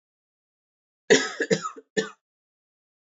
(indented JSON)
{
  "cough_length": "3.1 s",
  "cough_amplitude": 19256,
  "cough_signal_mean_std_ratio": 0.28,
  "survey_phase": "beta (2021-08-13 to 2022-03-07)",
  "age": "18-44",
  "gender": "Male",
  "wearing_mask": "No",
  "symptom_cough_any": true,
  "symptom_runny_or_blocked_nose": true,
  "symptom_fatigue": true,
  "symptom_headache": true,
  "smoker_status": "Never smoked",
  "respiratory_condition_asthma": false,
  "respiratory_condition_other": false,
  "recruitment_source": "Test and Trace",
  "submission_delay": "2 days",
  "covid_test_result": "Positive",
  "covid_test_method": "RT-qPCR",
  "covid_ct_value": 22.6,
  "covid_ct_gene": "N gene"
}